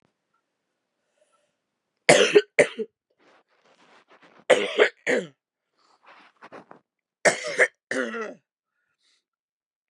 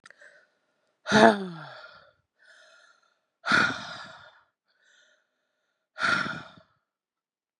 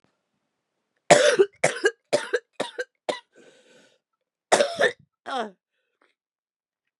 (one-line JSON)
{"three_cough_length": "9.9 s", "three_cough_amplitude": 29616, "three_cough_signal_mean_std_ratio": 0.27, "exhalation_length": "7.6 s", "exhalation_amplitude": 29717, "exhalation_signal_mean_std_ratio": 0.28, "cough_length": "7.0 s", "cough_amplitude": 31370, "cough_signal_mean_std_ratio": 0.31, "survey_phase": "beta (2021-08-13 to 2022-03-07)", "age": "18-44", "gender": "Female", "wearing_mask": "No", "symptom_cough_any": true, "symptom_shortness_of_breath": true, "symptom_sore_throat": true, "symptom_diarrhoea": true, "symptom_fatigue": true, "symptom_headache": true, "symptom_onset": "3 days", "smoker_status": "Never smoked", "respiratory_condition_asthma": true, "respiratory_condition_other": false, "recruitment_source": "Test and Trace", "submission_delay": "1 day", "covid_test_result": "Positive", "covid_test_method": "RT-qPCR", "covid_ct_value": 32.0, "covid_ct_gene": "ORF1ab gene", "covid_ct_mean": 32.5, "covid_viral_load": "21 copies/ml", "covid_viral_load_category": "Minimal viral load (< 10K copies/ml)"}